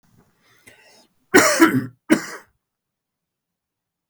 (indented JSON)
{
  "cough_length": "4.1 s",
  "cough_amplitude": 32768,
  "cough_signal_mean_std_ratio": 0.29,
  "survey_phase": "beta (2021-08-13 to 2022-03-07)",
  "age": "45-64",
  "gender": "Male",
  "wearing_mask": "No",
  "symptom_none": true,
  "smoker_status": "Ex-smoker",
  "respiratory_condition_asthma": false,
  "respiratory_condition_other": false,
  "recruitment_source": "REACT",
  "submission_delay": "2 days",
  "covid_test_result": "Negative",
  "covid_test_method": "RT-qPCR",
  "influenza_a_test_result": "Negative",
  "influenza_b_test_result": "Negative"
}